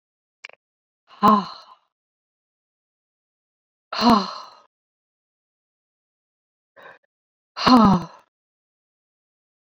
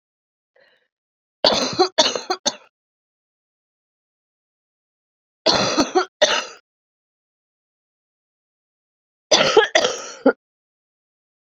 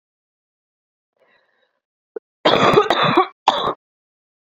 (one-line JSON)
{"exhalation_length": "9.7 s", "exhalation_amplitude": 25965, "exhalation_signal_mean_std_ratio": 0.25, "three_cough_length": "11.4 s", "three_cough_amplitude": 32768, "three_cough_signal_mean_std_ratio": 0.31, "cough_length": "4.4 s", "cough_amplitude": 32767, "cough_signal_mean_std_ratio": 0.36, "survey_phase": "beta (2021-08-13 to 2022-03-07)", "age": "45-64", "gender": "Female", "wearing_mask": "No", "symptom_cough_any": true, "symptom_runny_or_blocked_nose": true, "symptom_sore_throat": true, "symptom_fatigue": true, "symptom_fever_high_temperature": true, "symptom_headache": true, "symptom_onset": "3 days", "smoker_status": "Ex-smoker", "respiratory_condition_asthma": false, "respiratory_condition_other": false, "recruitment_source": "Test and Trace", "submission_delay": "1 day", "covid_test_result": "Positive", "covid_test_method": "ePCR"}